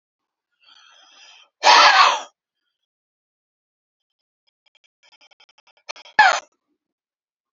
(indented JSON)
{
  "exhalation_length": "7.5 s",
  "exhalation_amplitude": 29021,
  "exhalation_signal_mean_std_ratio": 0.25,
  "survey_phase": "alpha (2021-03-01 to 2021-08-12)",
  "age": "65+",
  "gender": "Male",
  "wearing_mask": "No",
  "symptom_none": true,
  "smoker_status": "Never smoked",
  "respiratory_condition_asthma": false,
  "respiratory_condition_other": false,
  "recruitment_source": "REACT",
  "submission_delay": "1 day",
  "covid_test_result": "Negative",
  "covid_test_method": "RT-qPCR"
}